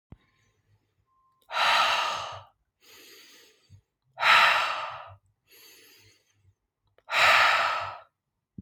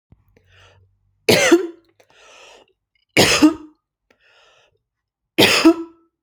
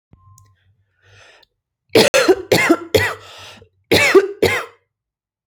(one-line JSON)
{"exhalation_length": "8.6 s", "exhalation_amplitude": 16910, "exhalation_signal_mean_std_ratio": 0.41, "three_cough_length": "6.2 s", "three_cough_amplitude": 32767, "three_cough_signal_mean_std_ratio": 0.34, "cough_length": "5.5 s", "cough_amplitude": 31806, "cough_signal_mean_std_ratio": 0.41, "survey_phase": "alpha (2021-03-01 to 2021-08-12)", "age": "18-44", "gender": "Female", "wearing_mask": "No", "symptom_none": true, "smoker_status": "Current smoker (1 to 10 cigarettes per day)", "respiratory_condition_asthma": false, "respiratory_condition_other": false, "recruitment_source": "REACT", "submission_delay": "2 days", "covid_test_result": "Negative", "covid_test_method": "RT-qPCR"}